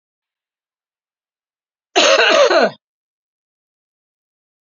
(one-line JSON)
{"cough_length": "4.6 s", "cough_amplitude": 31202, "cough_signal_mean_std_ratio": 0.33, "survey_phase": "beta (2021-08-13 to 2022-03-07)", "age": "45-64", "gender": "Female", "wearing_mask": "No", "symptom_runny_or_blocked_nose": true, "symptom_fatigue": true, "symptom_onset": "4 days", "smoker_status": "Never smoked", "respiratory_condition_asthma": false, "respiratory_condition_other": false, "recruitment_source": "Test and Trace", "submission_delay": "2 days", "covid_test_result": "Positive", "covid_test_method": "RT-qPCR"}